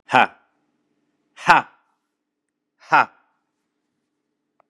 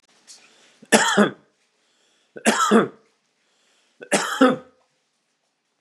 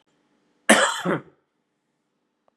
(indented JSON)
{
  "exhalation_length": "4.7 s",
  "exhalation_amplitude": 32768,
  "exhalation_signal_mean_std_ratio": 0.21,
  "three_cough_length": "5.8 s",
  "three_cough_amplitude": 32767,
  "three_cough_signal_mean_std_ratio": 0.35,
  "cough_length": "2.6 s",
  "cough_amplitude": 31348,
  "cough_signal_mean_std_ratio": 0.3,
  "survey_phase": "beta (2021-08-13 to 2022-03-07)",
  "age": "45-64",
  "gender": "Male",
  "wearing_mask": "No",
  "symptom_cough_any": true,
  "symptom_new_continuous_cough": true,
  "symptom_runny_or_blocked_nose": true,
  "symptom_sore_throat": true,
  "symptom_fatigue": true,
  "symptom_headache": true,
  "symptom_onset": "3 days",
  "smoker_status": "Never smoked",
  "respiratory_condition_asthma": false,
  "respiratory_condition_other": false,
  "recruitment_source": "Test and Trace",
  "submission_delay": "3 days",
  "covid_test_result": "Positive",
  "covid_test_method": "RT-qPCR",
  "covid_ct_value": 22.6,
  "covid_ct_gene": "N gene",
  "covid_ct_mean": 23.7,
  "covid_viral_load": "17000 copies/ml",
  "covid_viral_load_category": "Low viral load (10K-1M copies/ml)"
}